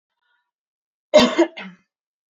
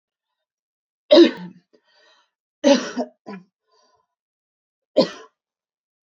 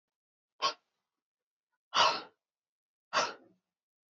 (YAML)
cough_length: 2.4 s
cough_amplitude: 26812
cough_signal_mean_std_ratio: 0.27
three_cough_length: 6.1 s
three_cough_amplitude: 27017
three_cough_signal_mean_std_ratio: 0.24
exhalation_length: 4.1 s
exhalation_amplitude: 7818
exhalation_signal_mean_std_ratio: 0.27
survey_phase: alpha (2021-03-01 to 2021-08-12)
age: 18-44
gender: Female
wearing_mask: 'No'
symptom_cough_any: true
smoker_status: Never smoked
respiratory_condition_asthma: false
respiratory_condition_other: false
recruitment_source: REACT
submission_delay: 14 days
covid_test_result: Negative
covid_test_method: RT-qPCR